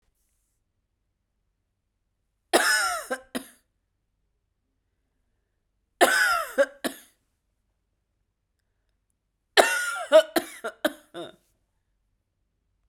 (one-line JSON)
{"three_cough_length": "12.9 s", "three_cough_amplitude": 32767, "three_cough_signal_mean_std_ratio": 0.28, "survey_phase": "beta (2021-08-13 to 2022-03-07)", "age": "18-44", "gender": "Female", "wearing_mask": "No", "symptom_cough_any": true, "symptom_runny_or_blocked_nose": true, "symptom_sore_throat": true, "symptom_fatigue": true, "symptom_headache": true, "symptom_change_to_sense_of_smell_or_taste": true, "smoker_status": "Never smoked", "respiratory_condition_asthma": false, "respiratory_condition_other": false, "recruitment_source": "Test and Trace", "submission_delay": "2 days", "covid_test_result": "Positive", "covid_test_method": "RT-qPCR", "covid_ct_value": 32.5, "covid_ct_gene": "ORF1ab gene", "covid_ct_mean": 32.5, "covid_viral_load": "22 copies/ml", "covid_viral_load_category": "Minimal viral load (< 10K copies/ml)"}